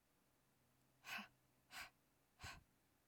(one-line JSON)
{"exhalation_length": "3.1 s", "exhalation_amplitude": 450, "exhalation_signal_mean_std_ratio": 0.41, "survey_phase": "alpha (2021-03-01 to 2021-08-12)", "age": "18-44", "gender": "Female", "wearing_mask": "No", "symptom_none": true, "smoker_status": "Never smoked", "respiratory_condition_asthma": false, "respiratory_condition_other": false, "recruitment_source": "REACT", "submission_delay": "2 days", "covid_test_result": "Negative", "covid_test_method": "RT-qPCR"}